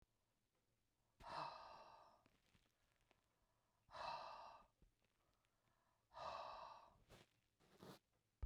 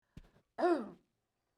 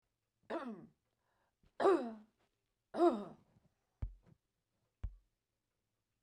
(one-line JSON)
{"exhalation_length": "8.5 s", "exhalation_amplitude": 430, "exhalation_signal_mean_std_ratio": 0.44, "cough_length": "1.6 s", "cough_amplitude": 2743, "cough_signal_mean_std_ratio": 0.34, "three_cough_length": "6.2 s", "three_cough_amplitude": 3368, "three_cough_signal_mean_std_ratio": 0.28, "survey_phase": "beta (2021-08-13 to 2022-03-07)", "age": "45-64", "gender": "Female", "wearing_mask": "No", "symptom_none": true, "symptom_onset": "12 days", "smoker_status": "Never smoked", "respiratory_condition_asthma": false, "respiratory_condition_other": false, "recruitment_source": "REACT", "submission_delay": "1 day", "covid_test_result": "Negative", "covid_test_method": "RT-qPCR"}